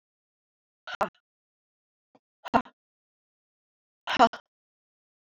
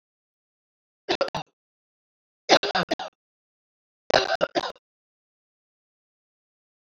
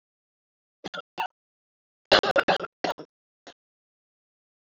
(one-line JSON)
{"exhalation_length": "5.4 s", "exhalation_amplitude": 18078, "exhalation_signal_mean_std_ratio": 0.17, "three_cough_length": "6.8 s", "three_cough_amplitude": 24280, "three_cough_signal_mean_std_ratio": 0.25, "cough_length": "4.7 s", "cough_amplitude": 21539, "cough_signal_mean_std_ratio": 0.25, "survey_phase": "alpha (2021-03-01 to 2021-08-12)", "age": "45-64", "gender": "Female", "wearing_mask": "No", "symptom_cough_any": true, "symptom_change_to_sense_of_smell_or_taste": true, "symptom_loss_of_taste": true, "symptom_onset": "11 days", "smoker_status": "Never smoked", "respiratory_condition_asthma": false, "respiratory_condition_other": false, "recruitment_source": "Test and Trace", "submission_delay": "2 days", "covid_test_result": "Positive", "covid_test_method": "RT-qPCR"}